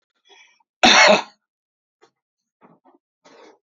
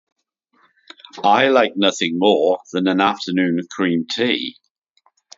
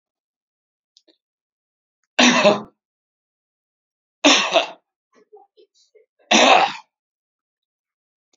{"cough_length": "3.8 s", "cough_amplitude": 31673, "cough_signal_mean_std_ratio": 0.26, "exhalation_length": "5.4 s", "exhalation_amplitude": 30825, "exhalation_signal_mean_std_ratio": 0.59, "three_cough_length": "8.4 s", "three_cough_amplitude": 31017, "three_cough_signal_mean_std_ratio": 0.29, "survey_phase": "beta (2021-08-13 to 2022-03-07)", "age": "65+", "gender": "Male", "wearing_mask": "No", "symptom_none": true, "symptom_onset": "10 days", "smoker_status": "Never smoked", "respiratory_condition_asthma": false, "respiratory_condition_other": false, "recruitment_source": "Test and Trace", "submission_delay": "8 days", "covid_test_result": "Positive", "covid_test_method": "RT-qPCR", "covid_ct_value": 21.7, "covid_ct_gene": "ORF1ab gene"}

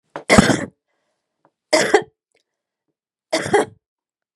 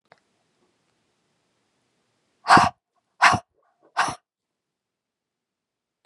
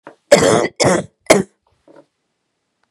{"three_cough_length": "4.4 s", "three_cough_amplitude": 32768, "three_cough_signal_mean_std_ratio": 0.32, "exhalation_length": "6.1 s", "exhalation_amplitude": 32144, "exhalation_signal_mean_std_ratio": 0.21, "cough_length": "2.9 s", "cough_amplitude": 32768, "cough_signal_mean_std_ratio": 0.38, "survey_phase": "beta (2021-08-13 to 2022-03-07)", "age": "45-64", "gender": "Female", "wearing_mask": "No", "symptom_runny_or_blocked_nose": true, "symptom_change_to_sense_of_smell_or_taste": true, "smoker_status": "Never smoked", "respiratory_condition_asthma": false, "respiratory_condition_other": false, "recruitment_source": "Test and Trace", "submission_delay": "2 days", "covid_test_result": "Positive", "covid_test_method": "RT-qPCR"}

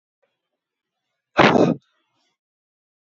{"exhalation_length": "3.1 s", "exhalation_amplitude": 27862, "exhalation_signal_mean_std_ratio": 0.26, "survey_phase": "beta (2021-08-13 to 2022-03-07)", "age": "45-64", "gender": "Male", "wearing_mask": "No", "symptom_none": true, "smoker_status": "Current smoker (11 or more cigarettes per day)", "respiratory_condition_asthma": false, "respiratory_condition_other": false, "recruitment_source": "REACT", "submission_delay": "4 days", "covid_test_result": "Negative", "covid_test_method": "RT-qPCR"}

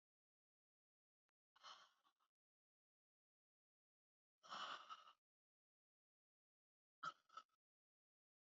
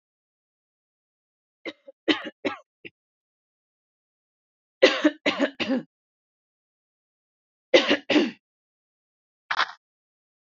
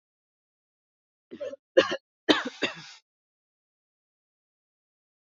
{"exhalation_length": "8.5 s", "exhalation_amplitude": 348, "exhalation_signal_mean_std_ratio": 0.24, "three_cough_length": "10.5 s", "three_cough_amplitude": 26035, "three_cough_signal_mean_std_ratio": 0.26, "cough_length": "5.3 s", "cough_amplitude": 19074, "cough_signal_mean_std_ratio": 0.21, "survey_phase": "beta (2021-08-13 to 2022-03-07)", "age": "18-44", "gender": "Female", "wearing_mask": "No", "symptom_none": true, "smoker_status": "Ex-smoker", "respiratory_condition_asthma": false, "respiratory_condition_other": false, "recruitment_source": "REACT", "submission_delay": "2 days", "covid_test_result": "Negative", "covid_test_method": "RT-qPCR", "influenza_a_test_result": "Negative", "influenza_b_test_result": "Negative"}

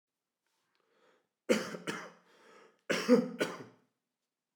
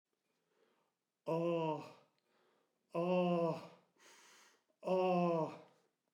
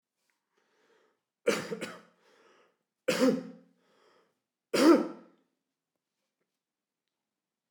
{"cough_length": "4.6 s", "cough_amplitude": 7790, "cough_signal_mean_std_ratio": 0.31, "exhalation_length": "6.1 s", "exhalation_amplitude": 2242, "exhalation_signal_mean_std_ratio": 0.48, "three_cough_length": "7.7 s", "three_cough_amplitude": 10846, "three_cough_signal_mean_std_ratio": 0.26, "survey_phase": "beta (2021-08-13 to 2022-03-07)", "age": "65+", "gender": "Male", "wearing_mask": "No", "symptom_none": true, "smoker_status": "Ex-smoker", "respiratory_condition_asthma": false, "respiratory_condition_other": true, "recruitment_source": "REACT", "submission_delay": "3 days", "covid_test_result": "Negative", "covid_test_method": "RT-qPCR"}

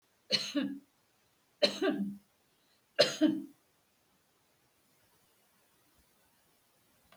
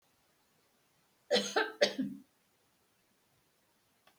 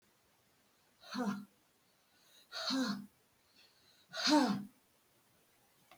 {"three_cough_length": "7.2 s", "three_cough_amplitude": 9393, "three_cough_signal_mean_std_ratio": 0.31, "cough_length": "4.2 s", "cough_amplitude": 7246, "cough_signal_mean_std_ratio": 0.29, "exhalation_length": "6.0 s", "exhalation_amplitude": 4091, "exhalation_signal_mean_std_ratio": 0.36, "survey_phase": "beta (2021-08-13 to 2022-03-07)", "age": "65+", "gender": "Female", "wearing_mask": "No", "symptom_none": true, "smoker_status": "Never smoked", "respiratory_condition_asthma": false, "respiratory_condition_other": false, "recruitment_source": "REACT", "submission_delay": "8 days", "covid_test_result": "Negative", "covid_test_method": "RT-qPCR"}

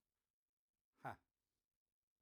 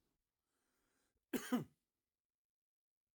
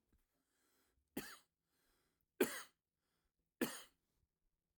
{"exhalation_length": "2.2 s", "exhalation_amplitude": 541, "exhalation_signal_mean_std_ratio": 0.17, "cough_length": "3.2 s", "cough_amplitude": 1516, "cough_signal_mean_std_ratio": 0.21, "three_cough_length": "4.8 s", "three_cough_amplitude": 2647, "three_cough_signal_mean_std_ratio": 0.21, "survey_phase": "alpha (2021-03-01 to 2021-08-12)", "age": "45-64", "gender": "Male", "wearing_mask": "No", "symptom_none": true, "smoker_status": "Never smoked", "respiratory_condition_asthma": true, "respiratory_condition_other": false, "recruitment_source": "REACT", "submission_delay": "1 day", "covid_test_result": "Negative", "covid_test_method": "RT-qPCR"}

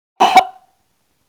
{"cough_length": "1.3 s", "cough_amplitude": 32768, "cough_signal_mean_std_ratio": 0.34, "survey_phase": "beta (2021-08-13 to 2022-03-07)", "age": "45-64", "gender": "Female", "wearing_mask": "No", "symptom_none": true, "smoker_status": "Prefer not to say", "respiratory_condition_asthma": false, "respiratory_condition_other": false, "recruitment_source": "REACT", "submission_delay": "5 days", "covid_test_result": "Negative", "covid_test_method": "RT-qPCR", "influenza_a_test_result": "Unknown/Void", "influenza_b_test_result": "Unknown/Void"}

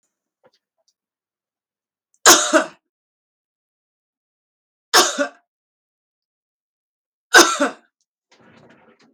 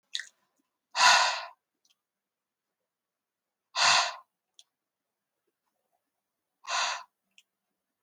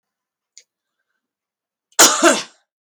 {"three_cough_length": "9.1 s", "three_cough_amplitude": 32768, "three_cough_signal_mean_std_ratio": 0.23, "exhalation_length": "8.0 s", "exhalation_amplitude": 14778, "exhalation_signal_mean_std_ratio": 0.28, "cough_length": "3.0 s", "cough_amplitude": 32768, "cough_signal_mean_std_ratio": 0.27, "survey_phase": "beta (2021-08-13 to 2022-03-07)", "age": "45-64", "gender": "Female", "wearing_mask": "No", "symptom_none": true, "symptom_onset": "12 days", "smoker_status": "Ex-smoker", "respiratory_condition_asthma": false, "respiratory_condition_other": false, "recruitment_source": "REACT", "submission_delay": "2 days", "covid_test_result": "Negative", "covid_test_method": "RT-qPCR", "influenza_a_test_result": "Negative", "influenza_b_test_result": "Negative"}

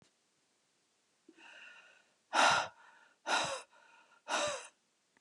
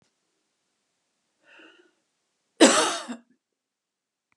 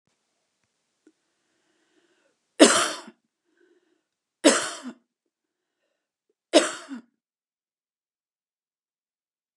{"exhalation_length": "5.2 s", "exhalation_amplitude": 6383, "exhalation_signal_mean_std_ratio": 0.35, "cough_length": "4.4 s", "cough_amplitude": 24173, "cough_signal_mean_std_ratio": 0.22, "three_cough_length": "9.6 s", "three_cough_amplitude": 30969, "three_cough_signal_mean_std_ratio": 0.2, "survey_phase": "beta (2021-08-13 to 2022-03-07)", "age": "45-64", "gender": "Female", "wearing_mask": "No", "symptom_none": true, "smoker_status": "Ex-smoker", "respiratory_condition_asthma": false, "respiratory_condition_other": false, "recruitment_source": "REACT", "submission_delay": "1 day", "covid_test_result": "Negative", "covid_test_method": "RT-qPCR", "influenza_a_test_result": "Negative", "influenza_b_test_result": "Negative"}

